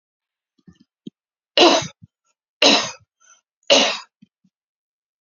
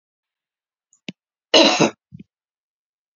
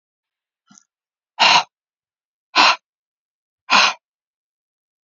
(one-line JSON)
{"three_cough_length": "5.2 s", "three_cough_amplitude": 32768, "three_cough_signal_mean_std_ratio": 0.3, "cough_length": "3.2 s", "cough_amplitude": 31366, "cough_signal_mean_std_ratio": 0.26, "exhalation_length": "5.0 s", "exhalation_amplitude": 32473, "exhalation_signal_mean_std_ratio": 0.28, "survey_phase": "beta (2021-08-13 to 2022-03-07)", "age": "45-64", "gender": "Female", "wearing_mask": "No", "symptom_fatigue": true, "symptom_onset": "12 days", "smoker_status": "Current smoker (1 to 10 cigarettes per day)", "respiratory_condition_asthma": false, "respiratory_condition_other": false, "recruitment_source": "REACT", "submission_delay": "1 day", "covid_test_result": "Negative", "covid_test_method": "RT-qPCR", "influenza_a_test_result": "Negative", "influenza_b_test_result": "Negative"}